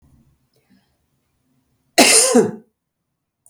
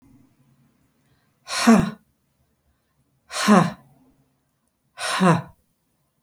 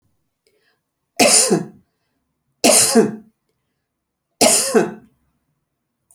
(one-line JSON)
{"cough_length": "3.5 s", "cough_amplitude": 32768, "cough_signal_mean_std_ratio": 0.31, "exhalation_length": "6.2 s", "exhalation_amplitude": 25828, "exhalation_signal_mean_std_ratio": 0.32, "three_cough_length": "6.1 s", "three_cough_amplitude": 32768, "three_cough_signal_mean_std_ratio": 0.38, "survey_phase": "beta (2021-08-13 to 2022-03-07)", "age": "45-64", "gender": "Female", "wearing_mask": "No", "symptom_none": true, "smoker_status": "Ex-smoker", "respiratory_condition_asthma": false, "respiratory_condition_other": false, "recruitment_source": "REACT", "submission_delay": "1 day", "covid_test_result": "Negative", "covid_test_method": "RT-qPCR"}